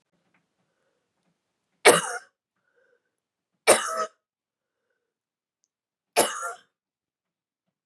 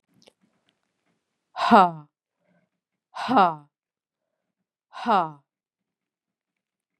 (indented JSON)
{
  "three_cough_length": "7.9 s",
  "three_cough_amplitude": 32431,
  "three_cough_signal_mean_std_ratio": 0.21,
  "exhalation_length": "7.0 s",
  "exhalation_amplitude": 25292,
  "exhalation_signal_mean_std_ratio": 0.24,
  "survey_phase": "beta (2021-08-13 to 2022-03-07)",
  "age": "45-64",
  "gender": "Female",
  "wearing_mask": "No",
  "symptom_cough_any": true,
  "symptom_runny_or_blocked_nose": true,
  "symptom_sore_throat": true,
  "symptom_fatigue": true,
  "symptom_headache": true,
  "symptom_change_to_sense_of_smell_or_taste": true,
  "symptom_loss_of_taste": true,
  "symptom_onset": "3 days",
  "smoker_status": "Ex-smoker",
  "respiratory_condition_asthma": false,
  "respiratory_condition_other": false,
  "recruitment_source": "Test and Trace",
  "submission_delay": "2 days",
  "covid_test_result": "Positive",
  "covid_test_method": "RT-qPCR",
  "covid_ct_value": 23.1,
  "covid_ct_gene": "ORF1ab gene"
}